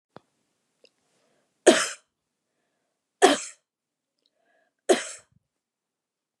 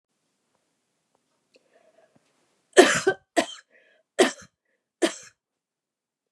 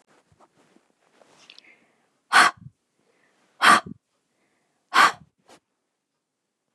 {
  "three_cough_length": "6.4 s",
  "three_cough_amplitude": 27623,
  "three_cough_signal_mean_std_ratio": 0.2,
  "cough_length": "6.3 s",
  "cough_amplitude": 29202,
  "cough_signal_mean_std_ratio": 0.22,
  "exhalation_length": "6.7 s",
  "exhalation_amplitude": 27792,
  "exhalation_signal_mean_std_ratio": 0.23,
  "survey_phase": "beta (2021-08-13 to 2022-03-07)",
  "age": "65+",
  "gender": "Female",
  "wearing_mask": "No",
  "symptom_headache": true,
  "smoker_status": "Ex-smoker",
  "respiratory_condition_asthma": false,
  "respiratory_condition_other": true,
  "recruitment_source": "REACT",
  "submission_delay": "0 days",
  "covid_test_result": "Negative",
  "covid_test_method": "RT-qPCR",
  "influenza_a_test_result": "Negative",
  "influenza_b_test_result": "Negative"
}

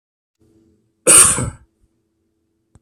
{
  "cough_length": "2.8 s",
  "cough_amplitude": 32768,
  "cough_signal_mean_std_ratio": 0.28,
  "survey_phase": "beta (2021-08-13 to 2022-03-07)",
  "age": "45-64",
  "gender": "Male",
  "wearing_mask": "No",
  "symptom_none": true,
  "smoker_status": "Never smoked",
  "respiratory_condition_asthma": false,
  "respiratory_condition_other": false,
  "recruitment_source": "REACT",
  "submission_delay": "33 days",
  "covid_test_result": "Negative",
  "covid_test_method": "RT-qPCR",
  "influenza_a_test_result": "Negative",
  "influenza_b_test_result": "Negative"
}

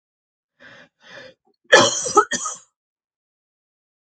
{
  "cough_length": "4.2 s",
  "cough_amplitude": 32767,
  "cough_signal_mean_std_ratio": 0.27,
  "survey_phase": "beta (2021-08-13 to 2022-03-07)",
  "age": "65+",
  "gender": "Female",
  "wearing_mask": "No",
  "symptom_none": true,
  "smoker_status": "Ex-smoker",
  "respiratory_condition_asthma": false,
  "respiratory_condition_other": false,
  "recruitment_source": "REACT",
  "submission_delay": "1 day",
  "covid_test_result": "Negative",
  "covid_test_method": "RT-qPCR",
  "influenza_a_test_result": "Negative",
  "influenza_b_test_result": "Negative"
}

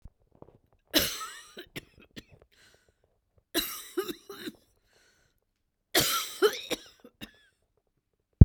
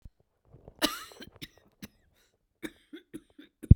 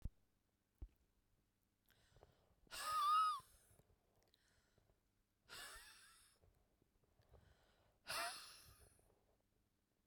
{
  "three_cough_length": "8.4 s",
  "three_cough_amplitude": 32768,
  "three_cough_signal_mean_std_ratio": 0.21,
  "cough_length": "3.8 s",
  "cough_amplitude": 28766,
  "cough_signal_mean_std_ratio": 0.13,
  "exhalation_length": "10.1 s",
  "exhalation_amplitude": 1008,
  "exhalation_signal_mean_std_ratio": 0.3,
  "survey_phase": "beta (2021-08-13 to 2022-03-07)",
  "age": "65+",
  "gender": "Female",
  "wearing_mask": "No",
  "symptom_cough_any": true,
  "symptom_runny_or_blocked_nose": true,
  "symptom_fatigue": true,
  "symptom_change_to_sense_of_smell_or_taste": true,
  "symptom_loss_of_taste": true,
  "smoker_status": "Never smoked",
  "respiratory_condition_asthma": true,
  "respiratory_condition_other": false,
  "recruitment_source": "REACT",
  "submission_delay": "1 day",
  "covid_test_result": "Negative",
  "covid_test_method": "RT-qPCR",
  "covid_ct_value": 45.0,
  "covid_ct_gene": "N gene"
}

